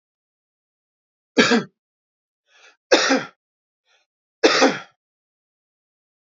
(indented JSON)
{
  "three_cough_length": "6.3 s",
  "three_cough_amplitude": 29418,
  "three_cough_signal_mean_std_ratio": 0.28,
  "survey_phase": "beta (2021-08-13 to 2022-03-07)",
  "age": "45-64",
  "gender": "Male",
  "wearing_mask": "No",
  "symptom_fatigue": true,
  "symptom_onset": "4 days",
  "smoker_status": "Never smoked",
  "respiratory_condition_asthma": false,
  "respiratory_condition_other": false,
  "recruitment_source": "REACT",
  "submission_delay": "1 day",
  "covid_test_result": "Negative",
  "covid_test_method": "RT-qPCR",
  "influenza_a_test_result": "Negative",
  "influenza_b_test_result": "Negative"
}